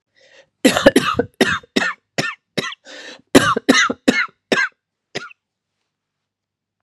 {"cough_length": "6.8 s", "cough_amplitude": 32768, "cough_signal_mean_std_ratio": 0.37, "survey_phase": "beta (2021-08-13 to 2022-03-07)", "age": "18-44", "gender": "Female", "wearing_mask": "No", "symptom_cough_any": true, "symptom_runny_or_blocked_nose": true, "symptom_sore_throat": true, "symptom_change_to_sense_of_smell_or_taste": true, "symptom_onset": "4 days", "smoker_status": "Never smoked", "respiratory_condition_asthma": false, "respiratory_condition_other": false, "recruitment_source": "Test and Trace", "submission_delay": "1 day", "covid_test_result": "Positive", "covid_test_method": "ePCR"}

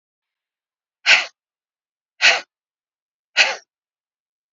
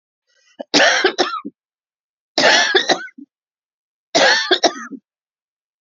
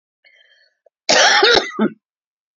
{"exhalation_length": "4.5 s", "exhalation_amplitude": 31738, "exhalation_signal_mean_std_ratio": 0.25, "three_cough_length": "5.8 s", "three_cough_amplitude": 32151, "three_cough_signal_mean_std_ratio": 0.44, "cough_length": "2.6 s", "cough_amplitude": 32767, "cough_signal_mean_std_ratio": 0.43, "survey_phase": "beta (2021-08-13 to 2022-03-07)", "age": "65+", "gender": "Female", "wearing_mask": "No", "symptom_none": true, "smoker_status": "Ex-smoker", "respiratory_condition_asthma": false, "respiratory_condition_other": false, "recruitment_source": "REACT", "submission_delay": "5 days", "covid_test_result": "Negative", "covid_test_method": "RT-qPCR", "influenza_a_test_result": "Negative", "influenza_b_test_result": "Negative"}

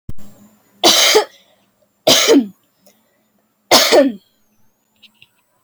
{"three_cough_length": "5.6 s", "three_cough_amplitude": 32768, "three_cough_signal_mean_std_ratio": 0.41, "survey_phase": "alpha (2021-03-01 to 2021-08-12)", "age": "18-44", "gender": "Female", "wearing_mask": "No", "symptom_cough_any": true, "symptom_fever_high_temperature": true, "symptom_onset": "3 days", "smoker_status": "Never smoked", "respiratory_condition_asthma": false, "respiratory_condition_other": false, "recruitment_source": "Test and Trace", "submission_delay": "2 days", "covid_test_result": "Positive", "covid_test_method": "RT-qPCR", "covid_ct_value": 23.9, "covid_ct_gene": "ORF1ab gene"}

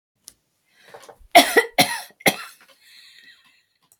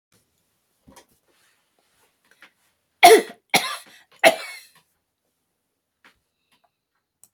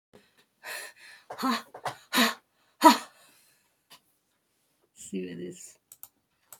{"cough_length": "4.0 s", "cough_amplitude": 31450, "cough_signal_mean_std_ratio": 0.26, "three_cough_length": "7.3 s", "three_cough_amplitude": 28967, "three_cough_signal_mean_std_ratio": 0.19, "exhalation_length": "6.6 s", "exhalation_amplitude": 25998, "exhalation_signal_mean_std_ratio": 0.26, "survey_phase": "beta (2021-08-13 to 2022-03-07)", "age": "65+", "gender": "Female", "wearing_mask": "No", "symptom_none": true, "smoker_status": "Never smoked", "respiratory_condition_asthma": false, "respiratory_condition_other": false, "recruitment_source": "REACT", "submission_delay": "2 days", "covid_test_result": "Negative", "covid_test_method": "RT-qPCR", "influenza_a_test_result": "Negative", "influenza_b_test_result": "Negative"}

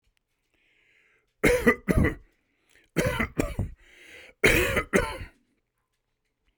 {"three_cough_length": "6.6 s", "three_cough_amplitude": 22449, "three_cough_signal_mean_std_ratio": 0.4, "survey_phase": "beta (2021-08-13 to 2022-03-07)", "age": "65+", "gender": "Male", "wearing_mask": "No", "symptom_none": true, "smoker_status": "Never smoked", "respiratory_condition_asthma": false, "respiratory_condition_other": false, "recruitment_source": "REACT", "submission_delay": "5 days", "covid_test_result": "Negative", "covid_test_method": "RT-qPCR"}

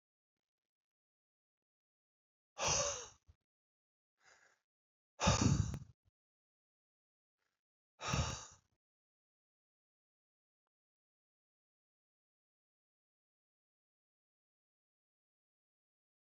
{"exhalation_length": "16.3 s", "exhalation_amplitude": 4015, "exhalation_signal_mean_std_ratio": 0.21, "survey_phase": "alpha (2021-03-01 to 2021-08-12)", "age": "45-64", "gender": "Male", "wearing_mask": "No", "symptom_none": true, "smoker_status": "Never smoked", "respiratory_condition_asthma": false, "respiratory_condition_other": false, "recruitment_source": "REACT", "submission_delay": "1 day", "covid_test_result": "Negative", "covid_test_method": "RT-qPCR"}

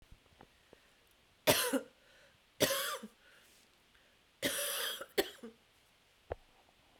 {"three_cough_length": "7.0 s", "three_cough_amplitude": 10371, "three_cough_signal_mean_std_ratio": 0.36, "survey_phase": "beta (2021-08-13 to 2022-03-07)", "age": "45-64", "gender": "Female", "wearing_mask": "Yes", "symptom_cough_any": true, "symptom_new_continuous_cough": true, "symptom_shortness_of_breath": true, "symptom_abdominal_pain": true, "symptom_fatigue": true, "symptom_fever_high_temperature": true, "symptom_headache": true, "symptom_change_to_sense_of_smell_or_taste": true, "symptom_onset": "2 days", "smoker_status": "Ex-smoker", "respiratory_condition_asthma": false, "respiratory_condition_other": false, "recruitment_source": "Test and Trace", "submission_delay": "2 days", "covid_test_result": "Positive", "covid_test_method": "RT-qPCR", "covid_ct_value": 26.3, "covid_ct_gene": "ORF1ab gene", "covid_ct_mean": 26.7, "covid_viral_load": "1700 copies/ml", "covid_viral_load_category": "Minimal viral load (< 10K copies/ml)"}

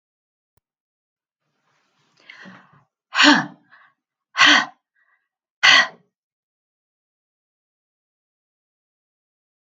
{"exhalation_length": "9.6 s", "exhalation_amplitude": 32767, "exhalation_signal_mean_std_ratio": 0.23, "survey_phase": "alpha (2021-03-01 to 2021-08-12)", "age": "65+", "gender": "Female", "wearing_mask": "No", "symptom_none": true, "smoker_status": "Never smoked", "respiratory_condition_asthma": false, "respiratory_condition_other": false, "recruitment_source": "REACT", "submission_delay": "2 days", "covid_test_result": "Negative", "covid_test_method": "RT-qPCR"}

